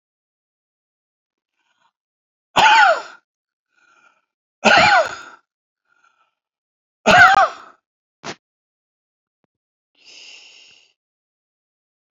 {"three_cough_length": "12.1 s", "three_cough_amplitude": 30868, "three_cough_signal_mean_std_ratio": 0.27, "survey_phase": "alpha (2021-03-01 to 2021-08-12)", "age": "65+", "gender": "Male", "wearing_mask": "No", "symptom_none": true, "smoker_status": "Ex-smoker", "respiratory_condition_asthma": false, "respiratory_condition_other": false, "recruitment_source": "REACT", "submission_delay": "2 days", "covid_test_result": "Negative", "covid_test_method": "RT-qPCR"}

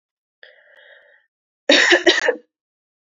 {"cough_length": "3.1 s", "cough_amplitude": 31321, "cough_signal_mean_std_ratio": 0.34, "survey_phase": "beta (2021-08-13 to 2022-03-07)", "age": "18-44", "gender": "Female", "wearing_mask": "No", "symptom_runny_or_blocked_nose": true, "smoker_status": "Never smoked", "respiratory_condition_asthma": false, "respiratory_condition_other": false, "recruitment_source": "REACT", "submission_delay": "2 days", "covid_test_result": "Negative", "covid_test_method": "RT-qPCR", "influenza_a_test_result": "Negative", "influenza_b_test_result": "Negative"}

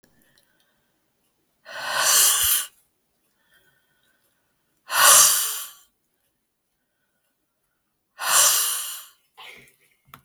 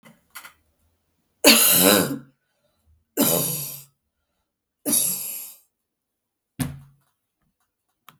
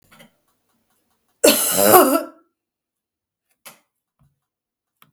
{"exhalation_length": "10.2 s", "exhalation_amplitude": 32766, "exhalation_signal_mean_std_ratio": 0.35, "three_cough_length": "8.2 s", "three_cough_amplitude": 32766, "three_cough_signal_mean_std_ratio": 0.35, "cough_length": "5.1 s", "cough_amplitude": 32768, "cough_signal_mean_std_ratio": 0.29, "survey_phase": "beta (2021-08-13 to 2022-03-07)", "age": "45-64", "gender": "Female", "wearing_mask": "No", "symptom_cough_any": true, "symptom_runny_or_blocked_nose": true, "symptom_sore_throat": true, "symptom_fatigue": true, "symptom_headache": true, "symptom_onset": "3 days", "smoker_status": "Never smoked", "respiratory_condition_asthma": false, "respiratory_condition_other": false, "recruitment_source": "Test and Trace", "submission_delay": "2 days", "covid_test_result": "Positive", "covid_test_method": "RT-qPCR", "covid_ct_value": 26.0, "covid_ct_gene": "ORF1ab gene", "covid_ct_mean": 26.7, "covid_viral_load": "1700 copies/ml", "covid_viral_load_category": "Minimal viral load (< 10K copies/ml)"}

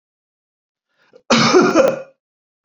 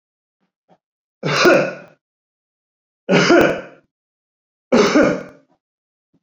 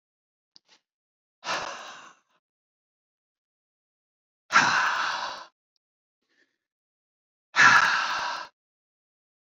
{"cough_length": "2.6 s", "cough_amplitude": 28310, "cough_signal_mean_std_ratio": 0.42, "three_cough_length": "6.2 s", "three_cough_amplitude": 27899, "three_cough_signal_mean_std_ratio": 0.39, "exhalation_length": "9.5 s", "exhalation_amplitude": 19304, "exhalation_signal_mean_std_ratio": 0.32, "survey_phase": "beta (2021-08-13 to 2022-03-07)", "age": "45-64", "gender": "Male", "wearing_mask": "No", "symptom_none": true, "smoker_status": "Never smoked", "respiratory_condition_asthma": true, "respiratory_condition_other": false, "recruitment_source": "REACT", "submission_delay": "2 days", "covid_test_result": "Negative", "covid_test_method": "RT-qPCR"}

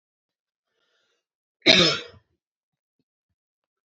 {"cough_length": "3.8 s", "cough_amplitude": 30122, "cough_signal_mean_std_ratio": 0.22, "survey_phase": "beta (2021-08-13 to 2022-03-07)", "age": "18-44", "gender": "Female", "wearing_mask": "No", "symptom_none": true, "smoker_status": "Never smoked", "respiratory_condition_asthma": false, "respiratory_condition_other": false, "recruitment_source": "REACT", "submission_delay": "2 days", "covid_test_result": "Negative", "covid_test_method": "RT-qPCR"}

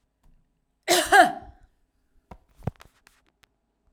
{"cough_length": "3.9 s", "cough_amplitude": 23321, "cough_signal_mean_std_ratio": 0.25, "survey_phase": "alpha (2021-03-01 to 2021-08-12)", "age": "45-64", "gender": "Female", "wearing_mask": "No", "symptom_none": true, "smoker_status": "Never smoked", "respiratory_condition_asthma": false, "respiratory_condition_other": false, "recruitment_source": "REACT", "submission_delay": "6 days", "covid_test_result": "Negative", "covid_test_method": "RT-qPCR"}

